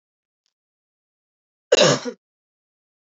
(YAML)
cough_length: 3.2 s
cough_amplitude: 23185
cough_signal_mean_std_ratio: 0.23
survey_phase: alpha (2021-03-01 to 2021-08-12)
age: 18-44
gender: Female
wearing_mask: 'No'
symptom_none: true
symptom_onset: 12 days
smoker_status: Never smoked
respiratory_condition_asthma: false
respiratory_condition_other: false
recruitment_source: REACT
submission_delay: 2 days
covid_test_result: Negative
covid_test_method: RT-qPCR